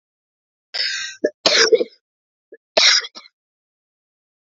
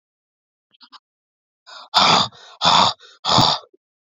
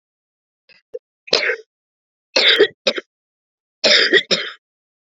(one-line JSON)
{"cough_length": "4.4 s", "cough_amplitude": 28651, "cough_signal_mean_std_ratio": 0.35, "exhalation_length": "4.0 s", "exhalation_amplitude": 31189, "exhalation_signal_mean_std_ratio": 0.41, "three_cough_length": "5.0 s", "three_cough_amplitude": 29011, "three_cough_signal_mean_std_ratio": 0.37, "survey_phase": "beta (2021-08-13 to 2022-03-07)", "age": "45-64", "gender": "Female", "wearing_mask": "No", "symptom_cough_any": true, "symptom_runny_or_blocked_nose": true, "symptom_shortness_of_breath": true, "symptom_sore_throat": true, "symptom_fatigue": true, "symptom_change_to_sense_of_smell_or_taste": true, "symptom_loss_of_taste": true, "symptom_onset": "11 days", "smoker_status": "Never smoked", "respiratory_condition_asthma": false, "respiratory_condition_other": false, "recruitment_source": "Test and Trace", "submission_delay": "4 days", "covid_test_method": "RT-qPCR", "covid_ct_value": 26.7, "covid_ct_gene": "N gene", "covid_ct_mean": 29.2, "covid_viral_load": "270 copies/ml", "covid_viral_load_category": "Minimal viral load (< 10K copies/ml)"}